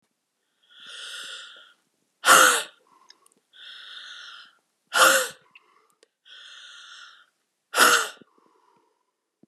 {"exhalation_length": "9.5 s", "exhalation_amplitude": 27031, "exhalation_signal_mean_std_ratio": 0.29, "survey_phase": "beta (2021-08-13 to 2022-03-07)", "age": "45-64", "gender": "Female", "wearing_mask": "No", "symptom_cough_any": true, "symptom_runny_or_blocked_nose": true, "symptom_sore_throat": true, "symptom_headache": true, "symptom_change_to_sense_of_smell_or_taste": true, "symptom_loss_of_taste": true, "symptom_onset": "3 days", "smoker_status": "Ex-smoker", "respiratory_condition_asthma": false, "respiratory_condition_other": false, "recruitment_source": "Test and Trace", "submission_delay": "2 days", "covid_test_result": "Positive", "covid_test_method": "RT-qPCR"}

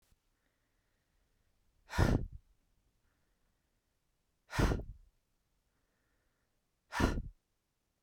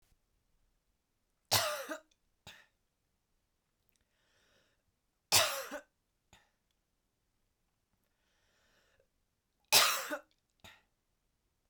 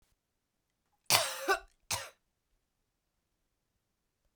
{"exhalation_length": "8.0 s", "exhalation_amplitude": 7237, "exhalation_signal_mean_std_ratio": 0.26, "three_cough_length": "11.7 s", "three_cough_amplitude": 10116, "three_cough_signal_mean_std_ratio": 0.22, "cough_length": "4.4 s", "cough_amplitude": 23297, "cough_signal_mean_std_ratio": 0.24, "survey_phase": "beta (2021-08-13 to 2022-03-07)", "age": "18-44", "gender": "Female", "wearing_mask": "No", "symptom_fatigue": true, "smoker_status": "Never smoked", "respiratory_condition_asthma": false, "respiratory_condition_other": false, "recruitment_source": "REACT", "submission_delay": "5 days", "covid_test_result": "Negative", "covid_test_method": "RT-qPCR"}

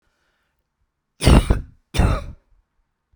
{"three_cough_length": "3.2 s", "three_cough_amplitude": 32768, "three_cough_signal_mean_std_ratio": 0.33, "survey_phase": "beta (2021-08-13 to 2022-03-07)", "age": "65+", "gender": "Female", "wearing_mask": "No", "symptom_none": true, "smoker_status": "Never smoked", "respiratory_condition_asthma": false, "respiratory_condition_other": false, "recruitment_source": "REACT", "submission_delay": "1 day", "covid_test_result": "Negative", "covid_test_method": "RT-qPCR", "influenza_a_test_result": "Negative", "influenza_b_test_result": "Negative"}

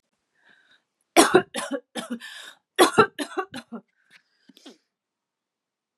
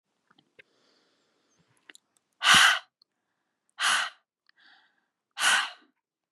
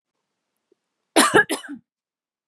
{"three_cough_length": "6.0 s", "three_cough_amplitude": 32767, "three_cough_signal_mean_std_ratio": 0.27, "exhalation_length": "6.3 s", "exhalation_amplitude": 18364, "exhalation_signal_mean_std_ratio": 0.29, "cough_length": "2.5 s", "cough_amplitude": 29737, "cough_signal_mean_std_ratio": 0.28, "survey_phase": "beta (2021-08-13 to 2022-03-07)", "age": "18-44", "gender": "Female", "wearing_mask": "No", "symptom_runny_or_blocked_nose": true, "symptom_change_to_sense_of_smell_or_taste": true, "smoker_status": "Ex-smoker", "respiratory_condition_asthma": false, "respiratory_condition_other": false, "recruitment_source": "REACT", "submission_delay": "1 day", "covid_test_result": "Negative", "covid_test_method": "RT-qPCR", "influenza_a_test_result": "Negative", "influenza_b_test_result": "Negative"}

